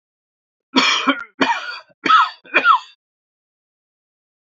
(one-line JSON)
{"three_cough_length": "4.4 s", "three_cough_amplitude": 30714, "three_cough_signal_mean_std_ratio": 0.41, "survey_phase": "beta (2021-08-13 to 2022-03-07)", "age": "65+", "gender": "Male", "wearing_mask": "No", "symptom_other": true, "symptom_onset": "8 days", "smoker_status": "Never smoked", "respiratory_condition_asthma": false, "respiratory_condition_other": false, "recruitment_source": "REACT", "submission_delay": "1 day", "covid_test_result": "Negative", "covid_test_method": "RT-qPCR", "influenza_a_test_result": "Negative", "influenza_b_test_result": "Negative"}